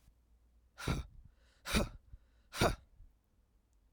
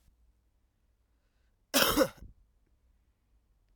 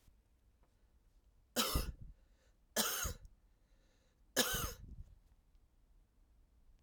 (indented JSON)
{
  "exhalation_length": "3.9 s",
  "exhalation_amplitude": 4785,
  "exhalation_signal_mean_std_ratio": 0.33,
  "cough_length": "3.8 s",
  "cough_amplitude": 13737,
  "cough_signal_mean_std_ratio": 0.24,
  "three_cough_length": "6.8 s",
  "three_cough_amplitude": 4785,
  "three_cough_signal_mean_std_ratio": 0.36,
  "survey_phase": "alpha (2021-03-01 to 2021-08-12)",
  "age": "18-44",
  "gender": "Male",
  "wearing_mask": "No",
  "symptom_cough_any": true,
  "symptom_new_continuous_cough": true,
  "symptom_loss_of_taste": true,
  "smoker_status": "Ex-smoker",
  "respiratory_condition_asthma": false,
  "respiratory_condition_other": false,
  "recruitment_source": "Test and Trace",
  "submission_delay": "1 day",
  "covid_test_result": "Positive",
  "covid_test_method": "RT-qPCR",
  "covid_ct_value": 24.4,
  "covid_ct_gene": "ORF1ab gene"
}